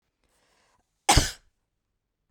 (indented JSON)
{
  "cough_length": "2.3 s",
  "cough_amplitude": 24288,
  "cough_signal_mean_std_ratio": 0.21,
  "survey_phase": "beta (2021-08-13 to 2022-03-07)",
  "age": "45-64",
  "gender": "Female",
  "wearing_mask": "No",
  "symptom_none": true,
  "smoker_status": "Never smoked",
  "respiratory_condition_asthma": false,
  "respiratory_condition_other": false,
  "recruitment_source": "REACT",
  "submission_delay": "1 day",
  "covid_test_method": "RT-qPCR",
  "influenza_a_test_result": "Unknown/Void",
  "influenza_b_test_result": "Unknown/Void"
}